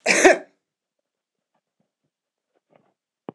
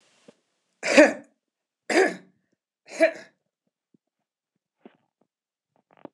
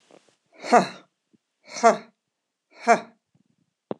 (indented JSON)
{
  "cough_length": "3.3 s",
  "cough_amplitude": 26028,
  "cough_signal_mean_std_ratio": 0.23,
  "three_cough_length": "6.1 s",
  "three_cough_amplitude": 26028,
  "three_cough_signal_mean_std_ratio": 0.23,
  "exhalation_length": "4.0 s",
  "exhalation_amplitude": 24771,
  "exhalation_signal_mean_std_ratio": 0.25,
  "survey_phase": "beta (2021-08-13 to 2022-03-07)",
  "age": "45-64",
  "gender": "Female",
  "wearing_mask": "No",
  "symptom_runny_or_blocked_nose": true,
  "symptom_headache": true,
  "symptom_onset": "6 days",
  "smoker_status": "Never smoked",
  "respiratory_condition_asthma": false,
  "respiratory_condition_other": false,
  "recruitment_source": "REACT",
  "submission_delay": "1 day",
  "covid_test_result": "Negative",
  "covid_test_method": "RT-qPCR",
  "influenza_a_test_result": "Negative",
  "influenza_b_test_result": "Negative"
}